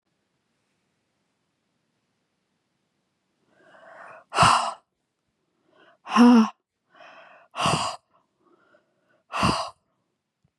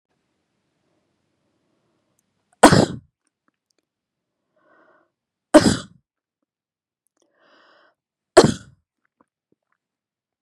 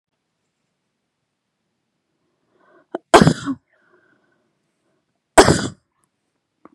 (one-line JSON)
{"exhalation_length": "10.6 s", "exhalation_amplitude": 19208, "exhalation_signal_mean_std_ratio": 0.27, "three_cough_length": "10.4 s", "three_cough_amplitude": 32768, "three_cough_signal_mean_std_ratio": 0.17, "cough_length": "6.7 s", "cough_amplitude": 32768, "cough_signal_mean_std_ratio": 0.2, "survey_phase": "beta (2021-08-13 to 2022-03-07)", "age": "45-64", "gender": "Female", "wearing_mask": "Yes", "symptom_none": true, "smoker_status": "Never smoked", "respiratory_condition_asthma": false, "respiratory_condition_other": false, "recruitment_source": "REACT", "submission_delay": "1 day", "covid_test_result": "Negative", "covid_test_method": "RT-qPCR", "influenza_a_test_result": "Negative", "influenza_b_test_result": "Negative"}